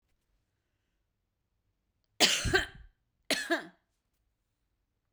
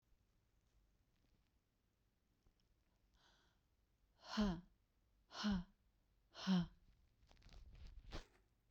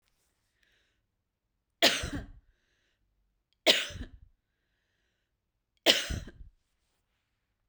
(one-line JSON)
{"cough_length": "5.1 s", "cough_amplitude": 14195, "cough_signal_mean_std_ratio": 0.27, "exhalation_length": "8.7 s", "exhalation_amplitude": 1275, "exhalation_signal_mean_std_ratio": 0.3, "three_cough_length": "7.7 s", "three_cough_amplitude": 20882, "three_cough_signal_mean_std_ratio": 0.24, "survey_phase": "beta (2021-08-13 to 2022-03-07)", "age": "45-64", "gender": "Female", "wearing_mask": "No", "symptom_cough_any": true, "symptom_sore_throat": true, "symptom_fatigue": true, "smoker_status": "Ex-smoker", "respiratory_condition_asthma": false, "respiratory_condition_other": false, "recruitment_source": "Test and Trace", "submission_delay": "2 days", "covid_test_result": "Positive", "covid_test_method": "RT-qPCR"}